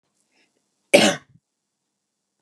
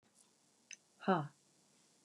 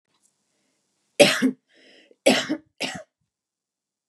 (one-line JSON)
{"cough_length": "2.4 s", "cough_amplitude": 32698, "cough_signal_mean_std_ratio": 0.22, "exhalation_length": "2.0 s", "exhalation_amplitude": 3696, "exhalation_signal_mean_std_ratio": 0.25, "three_cough_length": "4.1 s", "three_cough_amplitude": 32727, "three_cough_signal_mean_std_ratio": 0.28, "survey_phase": "beta (2021-08-13 to 2022-03-07)", "age": "18-44", "gender": "Female", "wearing_mask": "No", "symptom_cough_any": true, "symptom_new_continuous_cough": true, "symptom_fatigue": true, "symptom_onset": "12 days", "smoker_status": "Never smoked", "respiratory_condition_asthma": true, "respiratory_condition_other": false, "recruitment_source": "REACT", "submission_delay": "1 day", "covid_test_result": "Negative", "covid_test_method": "RT-qPCR", "influenza_a_test_result": "Negative", "influenza_b_test_result": "Negative"}